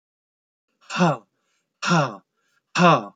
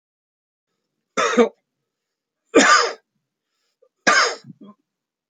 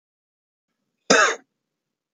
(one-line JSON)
{"exhalation_length": "3.2 s", "exhalation_amplitude": 26508, "exhalation_signal_mean_std_ratio": 0.39, "three_cough_length": "5.3 s", "three_cough_amplitude": 27677, "three_cough_signal_mean_std_ratio": 0.33, "cough_length": "2.1 s", "cough_amplitude": 26237, "cough_signal_mean_std_ratio": 0.26, "survey_phase": "beta (2021-08-13 to 2022-03-07)", "age": "65+", "gender": "Male", "wearing_mask": "No", "symptom_none": true, "smoker_status": "Never smoked", "respiratory_condition_asthma": false, "respiratory_condition_other": false, "recruitment_source": "REACT", "submission_delay": "1 day", "covid_test_result": "Negative", "covid_test_method": "RT-qPCR"}